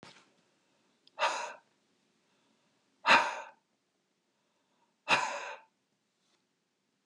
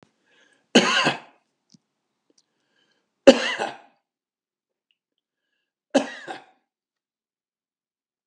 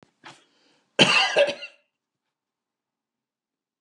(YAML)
exhalation_length: 7.1 s
exhalation_amplitude: 10483
exhalation_signal_mean_std_ratio: 0.26
three_cough_length: 8.3 s
three_cough_amplitude: 32768
three_cough_signal_mean_std_ratio: 0.21
cough_length: 3.8 s
cough_amplitude: 29649
cough_signal_mean_std_ratio: 0.29
survey_phase: beta (2021-08-13 to 2022-03-07)
age: 65+
gender: Male
wearing_mask: 'No'
symptom_none: true
smoker_status: Ex-smoker
respiratory_condition_asthma: false
respiratory_condition_other: false
recruitment_source: REACT
submission_delay: 2 days
covid_test_result: Negative
covid_test_method: RT-qPCR